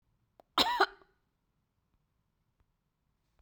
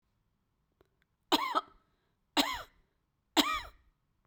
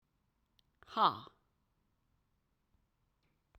{"cough_length": "3.4 s", "cough_amplitude": 8405, "cough_signal_mean_std_ratio": 0.21, "three_cough_length": "4.3 s", "three_cough_amplitude": 8143, "three_cough_signal_mean_std_ratio": 0.3, "exhalation_length": "3.6 s", "exhalation_amplitude": 5925, "exhalation_signal_mean_std_ratio": 0.18, "survey_phase": "beta (2021-08-13 to 2022-03-07)", "age": "45-64", "gender": "Female", "wearing_mask": "No", "symptom_none": true, "smoker_status": "Never smoked", "respiratory_condition_asthma": false, "respiratory_condition_other": false, "recruitment_source": "REACT", "submission_delay": "1 day", "covid_test_result": "Negative", "covid_test_method": "RT-qPCR", "influenza_a_test_result": "Negative", "influenza_b_test_result": "Negative"}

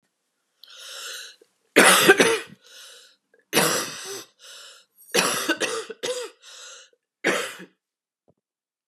{"three_cough_length": "8.9 s", "three_cough_amplitude": 30601, "three_cough_signal_mean_std_ratio": 0.37, "survey_phase": "beta (2021-08-13 to 2022-03-07)", "age": "45-64", "gender": "Female", "wearing_mask": "No", "symptom_cough_any": true, "symptom_runny_or_blocked_nose": true, "symptom_sore_throat": true, "symptom_headache": true, "symptom_change_to_sense_of_smell_or_taste": true, "symptom_loss_of_taste": true, "symptom_onset": "3 days", "smoker_status": "Ex-smoker", "respiratory_condition_asthma": false, "respiratory_condition_other": false, "recruitment_source": "Test and Trace", "submission_delay": "2 days", "covid_test_result": "Positive", "covid_test_method": "RT-qPCR"}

